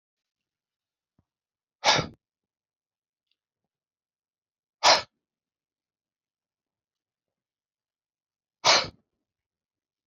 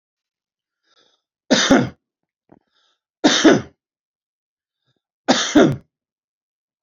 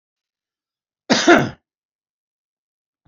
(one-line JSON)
{"exhalation_length": "10.1 s", "exhalation_amplitude": 21584, "exhalation_signal_mean_std_ratio": 0.18, "three_cough_length": "6.8 s", "three_cough_amplitude": 31283, "three_cough_signal_mean_std_ratio": 0.31, "cough_length": "3.1 s", "cough_amplitude": 28535, "cough_signal_mean_std_ratio": 0.25, "survey_phase": "beta (2021-08-13 to 2022-03-07)", "age": "65+", "gender": "Male", "wearing_mask": "No", "symptom_none": true, "smoker_status": "Ex-smoker", "respiratory_condition_asthma": false, "respiratory_condition_other": false, "recruitment_source": "REACT", "submission_delay": "2 days", "covid_test_result": "Negative", "covid_test_method": "RT-qPCR", "influenza_a_test_result": "Negative", "influenza_b_test_result": "Negative"}